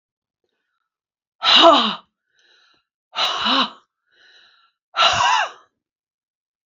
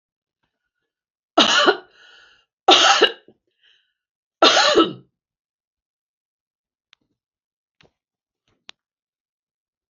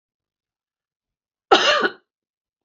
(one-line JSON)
{"exhalation_length": "6.7 s", "exhalation_amplitude": 31144, "exhalation_signal_mean_std_ratio": 0.37, "three_cough_length": "9.9 s", "three_cough_amplitude": 32342, "three_cough_signal_mean_std_ratio": 0.28, "cough_length": "2.6 s", "cough_amplitude": 32767, "cough_signal_mean_std_ratio": 0.28, "survey_phase": "beta (2021-08-13 to 2022-03-07)", "age": "45-64", "gender": "Female", "wearing_mask": "No", "symptom_none": true, "smoker_status": "Never smoked", "respiratory_condition_asthma": true, "respiratory_condition_other": false, "recruitment_source": "REACT", "submission_delay": "2 days", "covid_test_result": "Negative", "covid_test_method": "RT-qPCR", "influenza_a_test_result": "Negative", "influenza_b_test_result": "Negative"}